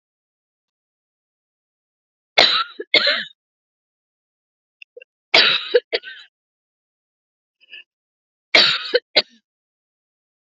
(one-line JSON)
{"three_cough_length": "10.6 s", "three_cough_amplitude": 30860, "three_cough_signal_mean_std_ratio": 0.27, "survey_phase": "beta (2021-08-13 to 2022-03-07)", "age": "45-64", "gender": "Female", "wearing_mask": "No", "symptom_none": true, "smoker_status": "Never smoked", "respiratory_condition_asthma": false, "respiratory_condition_other": false, "recruitment_source": "REACT", "submission_delay": "1 day", "covid_test_result": "Negative", "covid_test_method": "RT-qPCR", "influenza_a_test_result": "Negative", "influenza_b_test_result": "Negative"}